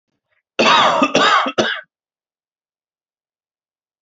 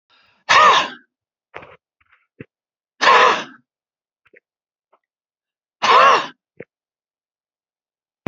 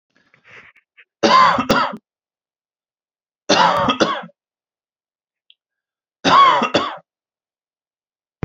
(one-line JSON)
{"cough_length": "4.0 s", "cough_amplitude": 30739, "cough_signal_mean_std_ratio": 0.42, "exhalation_length": "8.3 s", "exhalation_amplitude": 30593, "exhalation_signal_mean_std_ratio": 0.31, "three_cough_length": "8.4 s", "three_cough_amplitude": 29156, "three_cough_signal_mean_std_ratio": 0.38, "survey_phase": "alpha (2021-03-01 to 2021-08-12)", "age": "18-44", "gender": "Male", "wearing_mask": "No", "symptom_none": true, "smoker_status": "Ex-smoker", "respiratory_condition_asthma": true, "respiratory_condition_other": false, "recruitment_source": "REACT", "submission_delay": "1 day", "covid_test_result": "Negative", "covid_test_method": "RT-qPCR"}